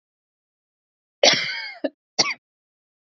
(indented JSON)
{
  "cough_length": "3.1 s",
  "cough_amplitude": 27340,
  "cough_signal_mean_std_ratio": 0.29,
  "survey_phase": "beta (2021-08-13 to 2022-03-07)",
  "age": "18-44",
  "gender": "Female",
  "wearing_mask": "No",
  "symptom_new_continuous_cough": true,
  "symptom_sore_throat": true,
  "symptom_diarrhoea": true,
  "symptom_fatigue": true,
  "symptom_other": true,
  "smoker_status": "Never smoked",
  "respiratory_condition_asthma": false,
  "respiratory_condition_other": false,
  "recruitment_source": "Test and Trace",
  "submission_delay": "2 days",
  "covid_test_result": "Positive",
  "covid_test_method": "RT-qPCR",
  "covid_ct_value": 30.3,
  "covid_ct_gene": "N gene"
}